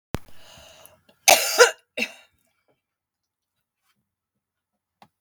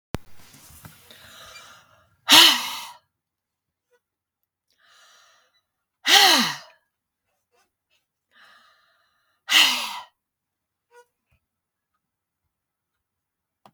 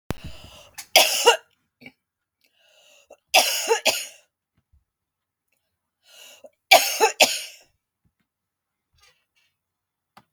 {"cough_length": "5.2 s", "cough_amplitude": 32768, "cough_signal_mean_std_ratio": 0.22, "exhalation_length": "13.7 s", "exhalation_amplitude": 32768, "exhalation_signal_mean_std_ratio": 0.23, "three_cough_length": "10.3 s", "three_cough_amplitude": 32766, "three_cough_signal_mean_std_ratio": 0.28, "survey_phase": "beta (2021-08-13 to 2022-03-07)", "age": "65+", "gender": "Female", "wearing_mask": "No", "symptom_cough_any": true, "symptom_sore_throat": true, "symptom_onset": "12 days", "smoker_status": "Never smoked", "respiratory_condition_asthma": false, "respiratory_condition_other": false, "recruitment_source": "REACT", "submission_delay": "2 days", "covid_test_result": "Negative", "covid_test_method": "RT-qPCR", "influenza_a_test_result": "Negative", "influenza_b_test_result": "Negative"}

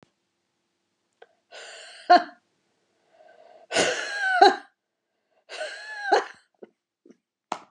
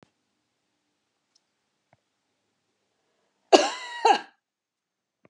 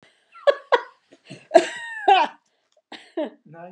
{"exhalation_length": "7.7 s", "exhalation_amplitude": 26123, "exhalation_signal_mean_std_ratio": 0.29, "cough_length": "5.3 s", "cough_amplitude": 31278, "cough_signal_mean_std_ratio": 0.19, "three_cough_length": "3.7 s", "three_cough_amplitude": 31301, "three_cough_signal_mean_std_ratio": 0.33, "survey_phase": "beta (2021-08-13 to 2022-03-07)", "age": "65+", "gender": "Female", "wearing_mask": "No", "symptom_none": true, "smoker_status": "Never smoked", "respiratory_condition_asthma": false, "respiratory_condition_other": false, "recruitment_source": "REACT", "submission_delay": "3 days", "covid_test_result": "Negative", "covid_test_method": "RT-qPCR", "influenza_a_test_result": "Negative", "influenza_b_test_result": "Negative"}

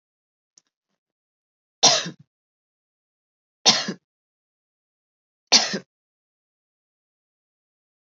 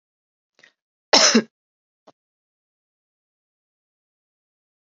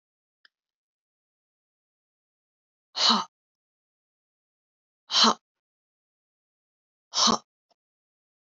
{"three_cough_length": "8.1 s", "three_cough_amplitude": 32768, "three_cough_signal_mean_std_ratio": 0.2, "cough_length": "4.9 s", "cough_amplitude": 30428, "cough_signal_mean_std_ratio": 0.18, "exhalation_length": "8.5 s", "exhalation_amplitude": 16250, "exhalation_signal_mean_std_ratio": 0.22, "survey_phase": "beta (2021-08-13 to 2022-03-07)", "age": "18-44", "gender": "Female", "wearing_mask": "No", "symptom_fatigue": true, "symptom_headache": true, "symptom_onset": "4 days", "smoker_status": "Never smoked", "respiratory_condition_asthma": false, "respiratory_condition_other": false, "recruitment_source": "Test and Trace", "submission_delay": "1 day", "covid_test_result": "Negative", "covid_test_method": "RT-qPCR"}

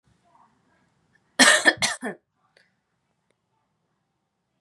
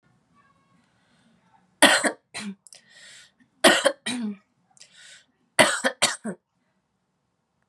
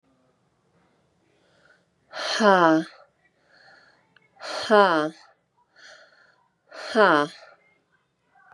{"cough_length": "4.6 s", "cough_amplitude": 30925, "cough_signal_mean_std_ratio": 0.23, "three_cough_length": "7.7 s", "three_cough_amplitude": 31564, "three_cough_signal_mean_std_ratio": 0.29, "exhalation_length": "8.5 s", "exhalation_amplitude": 26069, "exhalation_signal_mean_std_ratio": 0.3, "survey_phase": "beta (2021-08-13 to 2022-03-07)", "age": "18-44", "gender": "Female", "wearing_mask": "Yes", "symptom_fatigue": true, "symptom_headache": true, "symptom_onset": "13 days", "smoker_status": "Current smoker (1 to 10 cigarettes per day)", "respiratory_condition_asthma": false, "respiratory_condition_other": false, "recruitment_source": "REACT", "submission_delay": "3 days", "covid_test_result": "Negative", "covid_test_method": "RT-qPCR", "influenza_a_test_result": "Negative", "influenza_b_test_result": "Negative"}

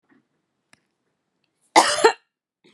{"cough_length": "2.7 s", "cough_amplitude": 32763, "cough_signal_mean_std_ratio": 0.25, "survey_phase": "beta (2021-08-13 to 2022-03-07)", "age": "18-44", "gender": "Female", "wearing_mask": "No", "symptom_runny_or_blocked_nose": true, "symptom_sore_throat": true, "symptom_fatigue": true, "symptom_headache": true, "symptom_onset": "3 days", "smoker_status": "Never smoked", "respiratory_condition_asthma": false, "respiratory_condition_other": false, "recruitment_source": "Test and Trace", "submission_delay": "2 days", "covid_test_result": "Positive", "covid_test_method": "RT-qPCR", "covid_ct_value": 25.8, "covid_ct_gene": "ORF1ab gene", "covid_ct_mean": 26.1, "covid_viral_load": "2800 copies/ml", "covid_viral_load_category": "Minimal viral load (< 10K copies/ml)"}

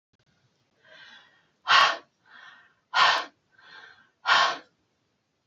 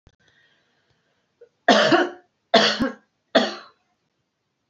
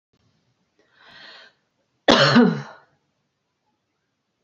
{"exhalation_length": "5.5 s", "exhalation_amplitude": 17440, "exhalation_signal_mean_std_ratio": 0.32, "three_cough_length": "4.7 s", "three_cough_amplitude": 26283, "three_cough_signal_mean_std_ratio": 0.35, "cough_length": "4.4 s", "cough_amplitude": 28204, "cough_signal_mean_std_ratio": 0.27, "survey_phase": "beta (2021-08-13 to 2022-03-07)", "age": "45-64", "gender": "Female", "wearing_mask": "No", "symptom_none": true, "smoker_status": "Current smoker (1 to 10 cigarettes per day)", "respiratory_condition_asthma": false, "respiratory_condition_other": false, "recruitment_source": "REACT", "submission_delay": "3 days", "covid_test_result": "Negative", "covid_test_method": "RT-qPCR", "influenza_a_test_result": "Negative", "influenza_b_test_result": "Negative"}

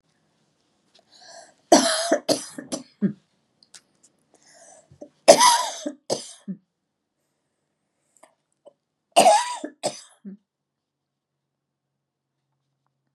{"three_cough_length": "13.1 s", "three_cough_amplitude": 32768, "three_cough_signal_mean_std_ratio": 0.26, "survey_phase": "beta (2021-08-13 to 2022-03-07)", "age": "65+", "gender": "Female", "wearing_mask": "No", "symptom_none": true, "smoker_status": "Ex-smoker", "respiratory_condition_asthma": false, "respiratory_condition_other": false, "recruitment_source": "REACT", "submission_delay": "1 day", "covid_test_result": "Negative", "covid_test_method": "RT-qPCR"}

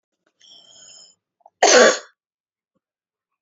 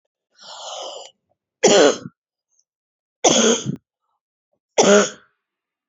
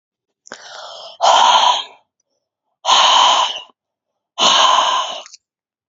{"cough_length": "3.4 s", "cough_amplitude": 30004, "cough_signal_mean_std_ratio": 0.26, "three_cough_length": "5.9 s", "three_cough_amplitude": 30102, "three_cough_signal_mean_std_ratio": 0.36, "exhalation_length": "5.9 s", "exhalation_amplitude": 32767, "exhalation_signal_mean_std_ratio": 0.53, "survey_phase": "beta (2021-08-13 to 2022-03-07)", "age": "45-64", "gender": "Female", "wearing_mask": "Yes", "symptom_runny_or_blocked_nose": true, "symptom_shortness_of_breath": true, "symptom_fever_high_temperature": true, "symptom_headache": true, "symptom_change_to_sense_of_smell_or_taste": true, "symptom_loss_of_taste": true, "symptom_onset": "2 days", "smoker_status": "Never smoked", "respiratory_condition_asthma": true, "respiratory_condition_other": false, "recruitment_source": "Test and Trace", "submission_delay": "2 days", "covid_test_result": "Positive", "covid_test_method": "RT-qPCR", "covid_ct_value": 30.1, "covid_ct_gene": "ORF1ab gene"}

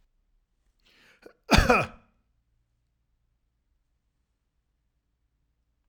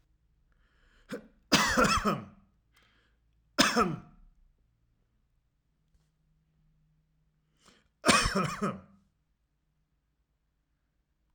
{"cough_length": "5.9 s", "cough_amplitude": 18303, "cough_signal_mean_std_ratio": 0.19, "three_cough_length": "11.3 s", "three_cough_amplitude": 14270, "three_cough_signal_mean_std_ratio": 0.31, "survey_phase": "alpha (2021-03-01 to 2021-08-12)", "age": "45-64", "gender": "Male", "wearing_mask": "No", "symptom_cough_any": true, "smoker_status": "Never smoked", "respiratory_condition_asthma": false, "respiratory_condition_other": false, "recruitment_source": "REACT", "submission_delay": "1 day", "covid_test_result": "Negative", "covid_test_method": "RT-qPCR"}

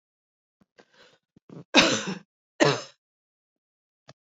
{"cough_length": "4.3 s", "cough_amplitude": 26926, "cough_signal_mean_std_ratio": 0.26, "survey_phase": "beta (2021-08-13 to 2022-03-07)", "age": "45-64", "gender": "Female", "wearing_mask": "No", "symptom_cough_any": true, "symptom_runny_or_blocked_nose": true, "symptom_sore_throat": true, "symptom_fatigue": true, "symptom_other": true, "smoker_status": "Never smoked", "respiratory_condition_asthma": false, "respiratory_condition_other": false, "recruitment_source": "Test and Trace", "submission_delay": "2 days", "covid_test_result": "Positive", "covid_test_method": "ePCR"}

